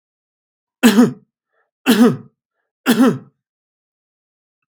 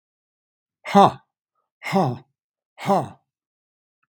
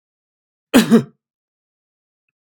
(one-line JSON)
{"three_cough_length": "4.7 s", "three_cough_amplitude": 32767, "three_cough_signal_mean_std_ratio": 0.34, "exhalation_length": "4.2 s", "exhalation_amplitude": 32767, "exhalation_signal_mean_std_ratio": 0.28, "cough_length": "2.4 s", "cough_amplitude": 32768, "cough_signal_mean_std_ratio": 0.25, "survey_phase": "alpha (2021-03-01 to 2021-08-12)", "age": "65+", "gender": "Male", "wearing_mask": "No", "symptom_cough_any": true, "symptom_fatigue": true, "symptom_change_to_sense_of_smell_or_taste": true, "smoker_status": "Ex-smoker", "respiratory_condition_asthma": false, "respiratory_condition_other": false, "recruitment_source": "Test and Trace", "submission_delay": "1 day", "covid_test_result": "Positive", "covid_test_method": "RT-qPCR", "covid_ct_value": 13.1, "covid_ct_gene": "ORF1ab gene", "covid_ct_mean": 13.3, "covid_viral_load": "42000000 copies/ml", "covid_viral_load_category": "High viral load (>1M copies/ml)"}